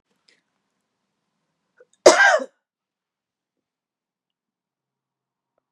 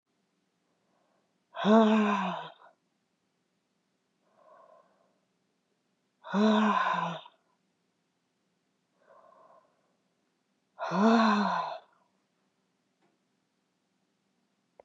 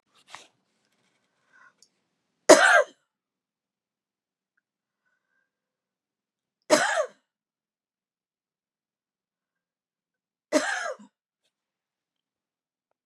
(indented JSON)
{
  "cough_length": "5.7 s",
  "cough_amplitude": 32768,
  "cough_signal_mean_std_ratio": 0.18,
  "exhalation_length": "14.8 s",
  "exhalation_amplitude": 11329,
  "exhalation_signal_mean_std_ratio": 0.34,
  "three_cough_length": "13.1 s",
  "three_cough_amplitude": 32742,
  "three_cough_signal_mean_std_ratio": 0.19,
  "survey_phase": "beta (2021-08-13 to 2022-03-07)",
  "age": "45-64",
  "gender": "Female",
  "wearing_mask": "No",
  "symptom_fatigue": true,
  "smoker_status": "Never smoked",
  "respiratory_condition_asthma": false,
  "respiratory_condition_other": false,
  "recruitment_source": "REACT",
  "submission_delay": "1 day",
  "covid_test_result": "Negative",
  "covid_test_method": "RT-qPCR",
  "influenza_a_test_result": "Negative",
  "influenza_b_test_result": "Negative"
}